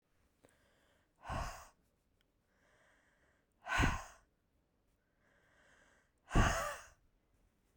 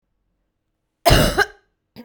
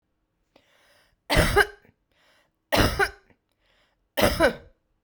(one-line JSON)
{"exhalation_length": "7.8 s", "exhalation_amplitude": 4898, "exhalation_signal_mean_std_ratio": 0.28, "cough_length": "2.0 s", "cough_amplitude": 32767, "cough_signal_mean_std_ratio": 0.33, "three_cough_length": "5.0 s", "three_cough_amplitude": 19976, "three_cough_signal_mean_std_ratio": 0.35, "survey_phase": "beta (2021-08-13 to 2022-03-07)", "age": "45-64", "gender": "Female", "wearing_mask": "No", "symptom_none": true, "smoker_status": "Current smoker (1 to 10 cigarettes per day)", "respiratory_condition_asthma": false, "respiratory_condition_other": false, "recruitment_source": "REACT", "submission_delay": "1 day", "covid_test_result": "Negative", "covid_test_method": "RT-qPCR"}